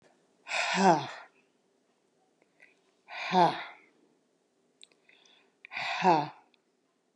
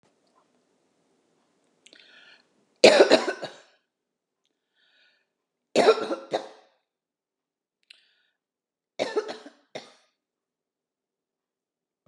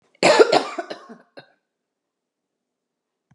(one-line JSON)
{"exhalation_length": "7.2 s", "exhalation_amplitude": 11376, "exhalation_signal_mean_std_ratio": 0.33, "three_cough_length": "12.1 s", "three_cough_amplitude": 30928, "three_cough_signal_mean_std_ratio": 0.21, "cough_length": "3.3 s", "cough_amplitude": 29354, "cough_signal_mean_std_ratio": 0.28, "survey_phase": "beta (2021-08-13 to 2022-03-07)", "age": "65+", "gender": "Female", "wearing_mask": "No", "symptom_none": true, "symptom_onset": "7 days", "smoker_status": "Never smoked", "respiratory_condition_asthma": false, "respiratory_condition_other": false, "recruitment_source": "REACT", "submission_delay": "1 day", "covid_test_result": "Negative", "covid_test_method": "RT-qPCR", "influenza_a_test_result": "Negative", "influenza_b_test_result": "Negative"}